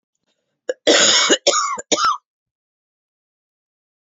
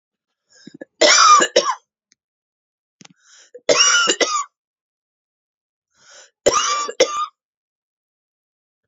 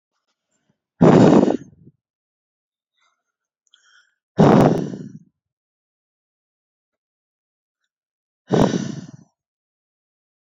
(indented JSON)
{
  "cough_length": "4.1 s",
  "cough_amplitude": 29379,
  "cough_signal_mean_std_ratio": 0.41,
  "three_cough_length": "8.9 s",
  "three_cough_amplitude": 32768,
  "three_cough_signal_mean_std_ratio": 0.37,
  "exhalation_length": "10.4 s",
  "exhalation_amplitude": 30332,
  "exhalation_signal_mean_std_ratio": 0.28,
  "survey_phase": "beta (2021-08-13 to 2022-03-07)",
  "age": "18-44",
  "gender": "Female",
  "wearing_mask": "No",
  "symptom_cough_any": true,
  "symptom_new_continuous_cough": true,
  "symptom_runny_or_blocked_nose": true,
  "symptom_shortness_of_breath": true,
  "symptom_sore_throat": true,
  "symptom_diarrhoea": true,
  "symptom_fatigue": true,
  "symptom_headache": true,
  "symptom_other": true,
  "symptom_onset": "4 days",
  "smoker_status": "Current smoker (1 to 10 cigarettes per day)",
  "respiratory_condition_asthma": false,
  "respiratory_condition_other": false,
  "recruitment_source": "Test and Trace",
  "submission_delay": "3 days",
  "covid_test_result": "Positive",
  "covid_test_method": "RT-qPCR",
  "covid_ct_value": 26.1,
  "covid_ct_gene": "ORF1ab gene"
}